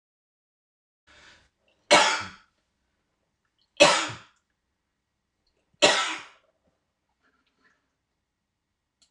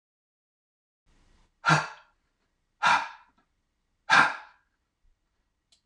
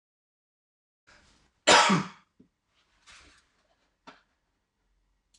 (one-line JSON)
{"three_cough_length": "9.1 s", "three_cough_amplitude": 25210, "three_cough_signal_mean_std_ratio": 0.23, "exhalation_length": "5.9 s", "exhalation_amplitude": 15463, "exhalation_signal_mean_std_ratio": 0.26, "cough_length": "5.4 s", "cough_amplitude": 19079, "cough_signal_mean_std_ratio": 0.21, "survey_phase": "beta (2021-08-13 to 2022-03-07)", "age": "45-64", "gender": "Male", "wearing_mask": "No", "symptom_cough_any": true, "symptom_fatigue": true, "symptom_onset": "3 days", "smoker_status": "Never smoked", "respiratory_condition_asthma": false, "respiratory_condition_other": false, "recruitment_source": "Test and Trace", "submission_delay": "2 days", "covid_test_result": "Positive", "covid_test_method": "ePCR"}